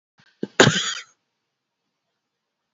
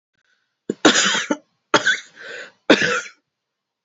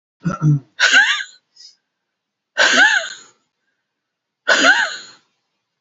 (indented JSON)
{
  "cough_length": "2.7 s",
  "cough_amplitude": 32768,
  "cough_signal_mean_std_ratio": 0.24,
  "three_cough_length": "3.8 s",
  "three_cough_amplitude": 30475,
  "three_cough_signal_mean_std_ratio": 0.39,
  "exhalation_length": "5.8 s",
  "exhalation_amplitude": 30665,
  "exhalation_signal_mean_std_ratio": 0.45,
  "survey_phase": "beta (2021-08-13 to 2022-03-07)",
  "age": "18-44",
  "gender": "Female",
  "wearing_mask": "No",
  "symptom_fatigue": true,
  "symptom_headache": true,
  "smoker_status": "Current smoker (e-cigarettes or vapes only)",
  "respiratory_condition_asthma": false,
  "respiratory_condition_other": false,
  "recruitment_source": "Test and Trace",
  "submission_delay": "-1 day",
  "covid_test_result": "Negative",
  "covid_test_method": "LFT"
}